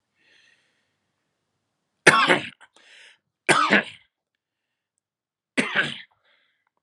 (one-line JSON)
{"three_cough_length": "6.8 s", "three_cough_amplitude": 31987, "three_cough_signal_mean_std_ratio": 0.28, "survey_phase": "alpha (2021-03-01 to 2021-08-12)", "age": "45-64", "gender": "Male", "wearing_mask": "No", "symptom_none": true, "smoker_status": "Never smoked", "respiratory_condition_asthma": false, "respiratory_condition_other": false, "recruitment_source": "Test and Trace", "submission_delay": "2 days", "covid_test_result": "Positive", "covid_test_method": "RT-qPCR", "covid_ct_value": 32.6, "covid_ct_gene": "N gene", "covid_ct_mean": 33.7, "covid_viral_load": "8.7 copies/ml", "covid_viral_load_category": "Minimal viral load (< 10K copies/ml)"}